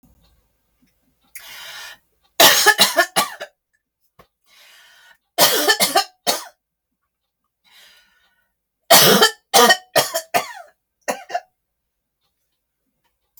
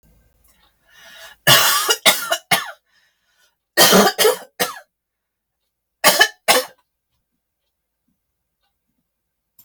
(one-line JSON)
{"three_cough_length": "13.4 s", "three_cough_amplitude": 32768, "three_cough_signal_mean_std_ratio": 0.33, "cough_length": "9.6 s", "cough_amplitude": 32768, "cough_signal_mean_std_ratio": 0.34, "survey_phase": "beta (2021-08-13 to 2022-03-07)", "age": "45-64", "gender": "Female", "wearing_mask": "No", "symptom_none": true, "smoker_status": "Never smoked", "respiratory_condition_asthma": false, "respiratory_condition_other": false, "recruitment_source": "REACT", "submission_delay": "1 day", "covid_test_result": "Negative", "covid_test_method": "RT-qPCR", "influenza_a_test_result": "Negative", "influenza_b_test_result": "Negative"}